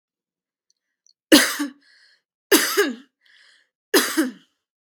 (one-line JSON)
{"three_cough_length": "4.9 s", "three_cough_amplitude": 32767, "three_cough_signal_mean_std_ratio": 0.33, "survey_phase": "beta (2021-08-13 to 2022-03-07)", "age": "18-44", "gender": "Female", "wearing_mask": "No", "symptom_runny_or_blocked_nose": true, "smoker_status": "Never smoked", "respiratory_condition_asthma": false, "respiratory_condition_other": false, "recruitment_source": "REACT", "submission_delay": "2 days", "covid_test_result": "Negative", "covid_test_method": "RT-qPCR", "influenza_a_test_result": "Negative", "influenza_b_test_result": "Negative"}